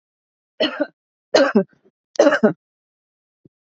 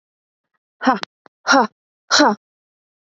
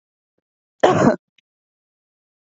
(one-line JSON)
{"three_cough_length": "3.8 s", "three_cough_amplitude": 28764, "three_cough_signal_mean_std_ratio": 0.33, "exhalation_length": "3.2 s", "exhalation_amplitude": 28917, "exhalation_signal_mean_std_ratio": 0.32, "cough_length": "2.6 s", "cough_amplitude": 27842, "cough_signal_mean_std_ratio": 0.27, "survey_phase": "beta (2021-08-13 to 2022-03-07)", "age": "18-44", "gender": "Female", "wearing_mask": "No", "symptom_none": true, "smoker_status": "Ex-smoker", "respiratory_condition_asthma": false, "respiratory_condition_other": false, "recruitment_source": "REACT", "submission_delay": "5 days", "covid_test_result": "Negative", "covid_test_method": "RT-qPCR", "influenza_a_test_result": "Negative", "influenza_b_test_result": "Negative"}